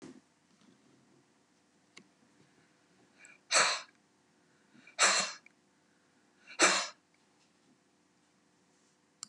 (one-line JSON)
{"exhalation_length": "9.3 s", "exhalation_amplitude": 8844, "exhalation_signal_mean_std_ratio": 0.25, "survey_phase": "beta (2021-08-13 to 2022-03-07)", "age": "65+", "gender": "Female", "wearing_mask": "No", "symptom_cough_any": true, "symptom_runny_or_blocked_nose": true, "symptom_sore_throat": true, "symptom_onset": "2 days", "smoker_status": "Never smoked", "respiratory_condition_asthma": false, "respiratory_condition_other": false, "recruitment_source": "Test and Trace", "submission_delay": "1 day", "covid_test_result": "Negative", "covid_test_method": "ePCR"}